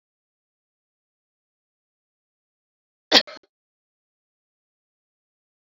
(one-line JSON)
{"cough_length": "5.6 s", "cough_amplitude": 32768, "cough_signal_mean_std_ratio": 0.1, "survey_phase": "alpha (2021-03-01 to 2021-08-12)", "age": "45-64", "gender": "Female", "wearing_mask": "No", "symptom_none": true, "smoker_status": "Never smoked", "respiratory_condition_asthma": false, "respiratory_condition_other": false, "recruitment_source": "REACT", "submission_delay": "1 day", "covid_test_result": "Negative", "covid_test_method": "RT-qPCR"}